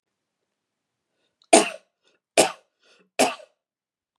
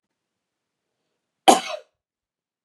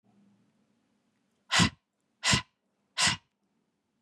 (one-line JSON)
{"three_cough_length": "4.2 s", "three_cough_amplitude": 31374, "three_cough_signal_mean_std_ratio": 0.22, "cough_length": "2.6 s", "cough_amplitude": 32767, "cough_signal_mean_std_ratio": 0.17, "exhalation_length": "4.0 s", "exhalation_amplitude": 11266, "exhalation_signal_mean_std_ratio": 0.29, "survey_phase": "beta (2021-08-13 to 2022-03-07)", "age": "18-44", "gender": "Female", "wearing_mask": "No", "symptom_runny_or_blocked_nose": true, "symptom_fatigue": true, "symptom_onset": "4 days", "smoker_status": "Never smoked", "respiratory_condition_asthma": false, "respiratory_condition_other": false, "recruitment_source": "Test and Trace", "submission_delay": "2 days", "covid_test_result": "Positive", "covid_test_method": "ePCR"}